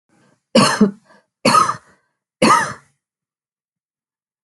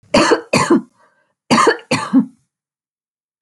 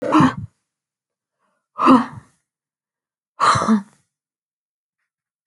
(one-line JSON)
{"three_cough_length": "4.4 s", "three_cough_amplitude": 30877, "three_cough_signal_mean_std_ratio": 0.36, "cough_length": "3.4 s", "cough_amplitude": 28908, "cough_signal_mean_std_ratio": 0.46, "exhalation_length": "5.5 s", "exhalation_amplitude": 27415, "exhalation_signal_mean_std_ratio": 0.33, "survey_phase": "alpha (2021-03-01 to 2021-08-12)", "age": "65+", "gender": "Female", "wearing_mask": "No", "symptom_none": true, "smoker_status": "Never smoked", "respiratory_condition_asthma": false, "respiratory_condition_other": false, "recruitment_source": "REACT", "submission_delay": "2 days", "covid_test_result": "Negative", "covid_test_method": "RT-qPCR"}